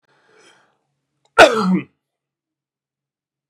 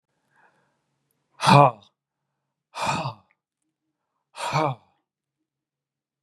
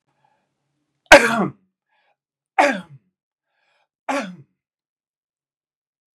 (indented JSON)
{
  "cough_length": "3.5 s",
  "cough_amplitude": 32768,
  "cough_signal_mean_std_ratio": 0.24,
  "exhalation_length": "6.2 s",
  "exhalation_amplitude": 31692,
  "exhalation_signal_mean_std_ratio": 0.25,
  "three_cough_length": "6.1 s",
  "three_cough_amplitude": 32768,
  "three_cough_signal_mean_std_ratio": 0.21,
  "survey_phase": "beta (2021-08-13 to 2022-03-07)",
  "age": "65+",
  "gender": "Male",
  "wearing_mask": "No",
  "symptom_none": true,
  "smoker_status": "Ex-smoker",
  "respiratory_condition_asthma": false,
  "respiratory_condition_other": false,
  "recruitment_source": "REACT",
  "submission_delay": "1 day",
  "covid_test_result": "Negative",
  "covid_test_method": "RT-qPCR"
}